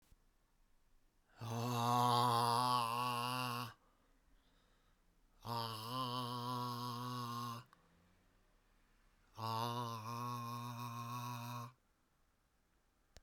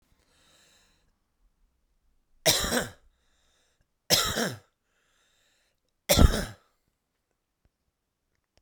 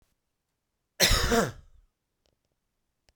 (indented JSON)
{
  "exhalation_length": "13.2 s",
  "exhalation_amplitude": 3092,
  "exhalation_signal_mean_std_ratio": 0.6,
  "three_cough_length": "8.6 s",
  "three_cough_amplitude": 18820,
  "three_cough_signal_mean_std_ratio": 0.25,
  "cough_length": "3.2 s",
  "cough_amplitude": 13519,
  "cough_signal_mean_std_ratio": 0.31,
  "survey_phase": "beta (2021-08-13 to 2022-03-07)",
  "age": "45-64",
  "gender": "Male",
  "wearing_mask": "No",
  "symptom_cough_any": true,
  "symptom_fatigue": true,
  "symptom_fever_high_temperature": true,
  "symptom_onset": "3 days",
  "smoker_status": "Ex-smoker",
  "respiratory_condition_asthma": true,
  "respiratory_condition_other": false,
  "recruitment_source": "Test and Trace",
  "submission_delay": "2 days",
  "covid_test_result": "Positive",
  "covid_test_method": "RT-qPCR",
  "covid_ct_value": 16.5,
  "covid_ct_gene": "ORF1ab gene",
  "covid_ct_mean": 16.6,
  "covid_viral_load": "3600000 copies/ml",
  "covid_viral_load_category": "High viral load (>1M copies/ml)"
}